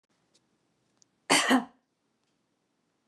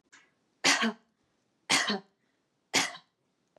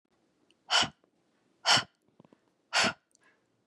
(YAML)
cough_length: 3.1 s
cough_amplitude: 16407
cough_signal_mean_std_ratio: 0.25
three_cough_length: 3.6 s
three_cough_amplitude: 10325
three_cough_signal_mean_std_ratio: 0.35
exhalation_length: 3.7 s
exhalation_amplitude: 11359
exhalation_signal_mean_std_ratio: 0.3
survey_phase: beta (2021-08-13 to 2022-03-07)
age: 18-44
gender: Female
wearing_mask: 'No'
symptom_none: true
smoker_status: Never smoked
respiratory_condition_asthma: false
respiratory_condition_other: false
recruitment_source: REACT
submission_delay: 0 days
covid_test_result: Negative
covid_test_method: RT-qPCR
influenza_a_test_result: Negative
influenza_b_test_result: Negative